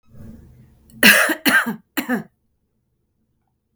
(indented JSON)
{
  "cough_length": "3.8 s",
  "cough_amplitude": 32768,
  "cough_signal_mean_std_ratio": 0.35,
  "survey_phase": "beta (2021-08-13 to 2022-03-07)",
  "age": "18-44",
  "gender": "Female",
  "wearing_mask": "No",
  "symptom_none": true,
  "smoker_status": "Ex-smoker",
  "respiratory_condition_asthma": false,
  "respiratory_condition_other": false,
  "recruitment_source": "REACT",
  "submission_delay": "7 days",
  "covid_test_result": "Negative",
  "covid_test_method": "RT-qPCR",
  "influenza_a_test_result": "Unknown/Void",
  "influenza_b_test_result": "Unknown/Void"
}